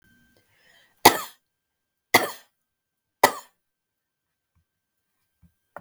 {"three_cough_length": "5.8 s", "three_cough_amplitude": 32768, "three_cough_signal_mean_std_ratio": 0.16, "survey_phase": "beta (2021-08-13 to 2022-03-07)", "age": "65+", "gender": "Female", "wearing_mask": "No", "symptom_none": true, "smoker_status": "Never smoked", "respiratory_condition_asthma": false, "respiratory_condition_other": false, "recruitment_source": "REACT", "submission_delay": "2 days", "covid_test_result": "Negative", "covid_test_method": "RT-qPCR", "influenza_a_test_result": "Negative", "influenza_b_test_result": "Negative"}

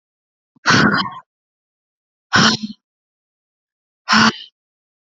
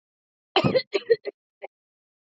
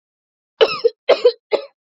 {"exhalation_length": "5.1 s", "exhalation_amplitude": 31617, "exhalation_signal_mean_std_ratio": 0.35, "cough_length": "2.4 s", "cough_amplitude": 16626, "cough_signal_mean_std_ratio": 0.3, "three_cough_length": "2.0 s", "three_cough_amplitude": 30997, "three_cough_signal_mean_std_ratio": 0.35, "survey_phase": "beta (2021-08-13 to 2022-03-07)", "age": "18-44", "gender": "Female", "wearing_mask": "No", "symptom_sore_throat": true, "symptom_fatigue": true, "symptom_headache": true, "symptom_onset": "13 days", "smoker_status": "Never smoked", "respiratory_condition_asthma": false, "respiratory_condition_other": false, "recruitment_source": "REACT", "submission_delay": "2 days", "covid_test_result": "Negative", "covid_test_method": "RT-qPCR"}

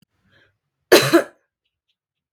{"cough_length": "2.3 s", "cough_amplitude": 32768, "cough_signal_mean_std_ratio": 0.26, "survey_phase": "beta (2021-08-13 to 2022-03-07)", "age": "18-44", "gender": "Female", "wearing_mask": "No", "symptom_sore_throat": true, "smoker_status": "Never smoked", "respiratory_condition_asthma": false, "respiratory_condition_other": false, "recruitment_source": "REACT", "submission_delay": "1 day", "covid_test_result": "Negative", "covid_test_method": "RT-qPCR"}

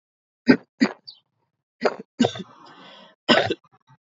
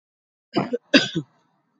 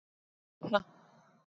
{"three_cough_length": "4.1 s", "three_cough_amplitude": 27409, "three_cough_signal_mean_std_ratio": 0.29, "cough_length": "1.8 s", "cough_amplitude": 27188, "cough_signal_mean_std_ratio": 0.31, "exhalation_length": "1.5 s", "exhalation_amplitude": 7510, "exhalation_signal_mean_std_ratio": 0.23, "survey_phase": "alpha (2021-03-01 to 2021-08-12)", "age": "18-44", "gender": "Female", "wearing_mask": "No", "symptom_fatigue": true, "symptom_fever_high_temperature": true, "symptom_headache": true, "symptom_onset": "2 days", "smoker_status": "Never smoked", "respiratory_condition_asthma": false, "respiratory_condition_other": false, "recruitment_source": "Test and Trace", "submission_delay": "2 days", "covid_test_result": "Positive", "covid_test_method": "RT-qPCR", "covid_ct_value": 15.0, "covid_ct_gene": "ORF1ab gene", "covid_ct_mean": 15.5, "covid_viral_load": "8500000 copies/ml", "covid_viral_load_category": "High viral load (>1M copies/ml)"}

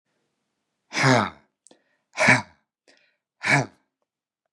{"exhalation_length": "4.5 s", "exhalation_amplitude": 25206, "exhalation_signal_mean_std_ratio": 0.32, "survey_phase": "beta (2021-08-13 to 2022-03-07)", "age": "65+", "gender": "Male", "wearing_mask": "No", "symptom_none": true, "smoker_status": "Never smoked", "respiratory_condition_asthma": false, "respiratory_condition_other": false, "recruitment_source": "REACT", "submission_delay": "4 days", "covid_test_result": "Negative", "covid_test_method": "RT-qPCR", "influenza_a_test_result": "Negative", "influenza_b_test_result": "Negative"}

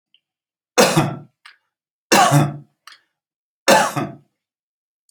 {"three_cough_length": "5.1 s", "three_cough_amplitude": 32579, "three_cough_signal_mean_std_ratio": 0.37, "survey_phase": "beta (2021-08-13 to 2022-03-07)", "age": "65+", "gender": "Male", "wearing_mask": "No", "symptom_sore_throat": true, "symptom_onset": "13 days", "smoker_status": "Never smoked", "respiratory_condition_asthma": false, "respiratory_condition_other": false, "recruitment_source": "REACT", "submission_delay": "0 days", "covid_test_result": "Negative", "covid_test_method": "RT-qPCR"}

